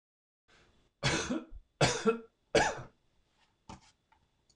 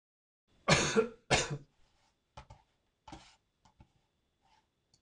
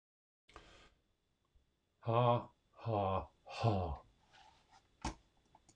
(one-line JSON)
{"three_cough_length": "4.6 s", "three_cough_amplitude": 8538, "three_cough_signal_mean_std_ratio": 0.35, "cough_length": "5.0 s", "cough_amplitude": 9356, "cough_signal_mean_std_ratio": 0.27, "exhalation_length": "5.8 s", "exhalation_amplitude": 3681, "exhalation_signal_mean_std_ratio": 0.39, "survey_phase": "beta (2021-08-13 to 2022-03-07)", "age": "65+", "gender": "Male", "wearing_mask": "No", "symptom_none": true, "smoker_status": "Never smoked", "respiratory_condition_asthma": false, "respiratory_condition_other": false, "recruitment_source": "REACT", "submission_delay": "6 days", "covid_test_result": "Negative", "covid_test_method": "RT-qPCR"}